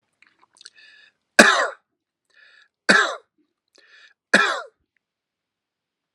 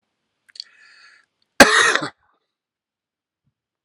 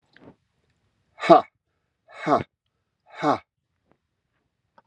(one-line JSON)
{"three_cough_length": "6.1 s", "three_cough_amplitude": 32768, "three_cough_signal_mean_std_ratio": 0.26, "cough_length": "3.8 s", "cough_amplitude": 32768, "cough_signal_mean_std_ratio": 0.23, "exhalation_length": "4.9 s", "exhalation_amplitude": 32324, "exhalation_signal_mean_std_ratio": 0.22, "survey_phase": "alpha (2021-03-01 to 2021-08-12)", "age": "65+", "gender": "Male", "wearing_mask": "No", "symptom_cough_any": true, "symptom_abdominal_pain": true, "symptom_headache": true, "symptom_onset": "4 days", "smoker_status": "Ex-smoker", "respiratory_condition_asthma": false, "respiratory_condition_other": false, "recruitment_source": "Test and Trace", "submission_delay": "1 day", "covid_test_result": "Positive", "covid_test_method": "RT-qPCR", "covid_ct_value": 26.5, "covid_ct_gene": "N gene"}